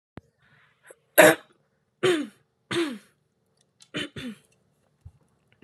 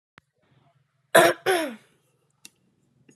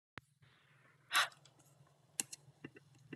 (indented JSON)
{
  "three_cough_length": "5.6 s",
  "three_cough_amplitude": 29810,
  "three_cough_signal_mean_std_ratio": 0.25,
  "cough_length": "3.2 s",
  "cough_amplitude": 24675,
  "cough_signal_mean_std_ratio": 0.27,
  "exhalation_length": "3.2 s",
  "exhalation_amplitude": 5853,
  "exhalation_signal_mean_std_ratio": 0.24,
  "survey_phase": "alpha (2021-03-01 to 2021-08-12)",
  "age": "18-44",
  "gender": "Female",
  "wearing_mask": "No",
  "symptom_none": true,
  "symptom_change_to_sense_of_smell_or_taste": true,
  "symptom_onset": "8 days",
  "smoker_status": "Never smoked",
  "respiratory_condition_asthma": false,
  "respiratory_condition_other": false,
  "recruitment_source": "Test and Trace",
  "submission_delay": "2 days",
  "covid_test_result": "Positive",
  "covid_test_method": "RT-qPCR",
  "covid_ct_value": 25.6,
  "covid_ct_gene": "N gene",
  "covid_ct_mean": 25.9,
  "covid_viral_load": "3200 copies/ml",
  "covid_viral_load_category": "Minimal viral load (< 10K copies/ml)"
}